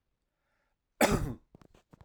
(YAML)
cough_length: 2.0 s
cough_amplitude: 11364
cough_signal_mean_std_ratio: 0.29
survey_phase: alpha (2021-03-01 to 2021-08-12)
age: 45-64
gender: Male
wearing_mask: 'No'
symptom_none: true
smoker_status: Never smoked
respiratory_condition_asthma: false
respiratory_condition_other: false
recruitment_source: REACT
submission_delay: 1 day
covid_test_result: Negative
covid_test_method: RT-qPCR